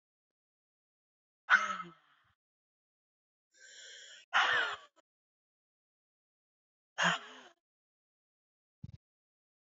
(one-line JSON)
{"exhalation_length": "9.7 s", "exhalation_amplitude": 7791, "exhalation_signal_mean_std_ratio": 0.24, "survey_phase": "beta (2021-08-13 to 2022-03-07)", "age": "18-44", "gender": "Female", "wearing_mask": "No", "symptom_cough_any": true, "symptom_headache": true, "smoker_status": "Ex-smoker", "respiratory_condition_asthma": false, "respiratory_condition_other": false, "recruitment_source": "REACT", "submission_delay": "1 day", "covid_test_result": "Negative", "covid_test_method": "RT-qPCR"}